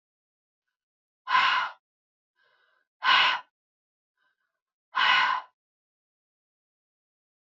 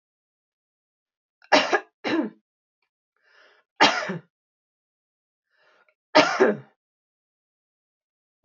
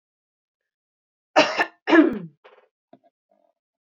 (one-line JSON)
{"exhalation_length": "7.5 s", "exhalation_amplitude": 11982, "exhalation_signal_mean_std_ratio": 0.32, "three_cough_length": "8.4 s", "three_cough_amplitude": 25596, "three_cough_signal_mean_std_ratio": 0.26, "cough_length": "3.8 s", "cough_amplitude": 25247, "cough_signal_mean_std_ratio": 0.28, "survey_phase": "beta (2021-08-13 to 2022-03-07)", "age": "65+", "gender": "Female", "wearing_mask": "No", "symptom_none": true, "smoker_status": "Never smoked", "respiratory_condition_asthma": false, "respiratory_condition_other": false, "recruitment_source": "REACT", "submission_delay": "3 days", "covid_test_result": "Negative", "covid_test_method": "RT-qPCR", "influenza_a_test_result": "Negative", "influenza_b_test_result": "Negative"}